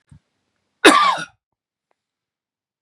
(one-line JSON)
{"cough_length": "2.8 s", "cough_amplitude": 32768, "cough_signal_mean_std_ratio": 0.27, "survey_phase": "beta (2021-08-13 to 2022-03-07)", "age": "45-64", "gender": "Male", "wearing_mask": "No", "symptom_cough_any": true, "symptom_runny_or_blocked_nose": true, "symptom_fatigue": true, "symptom_onset": "4 days", "smoker_status": "Ex-smoker", "respiratory_condition_asthma": false, "respiratory_condition_other": false, "recruitment_source": "Test and Trace", "submission_delay": "2 days", "covid_test_result": "Positive", "covid_test_method": "RT-qPCR"}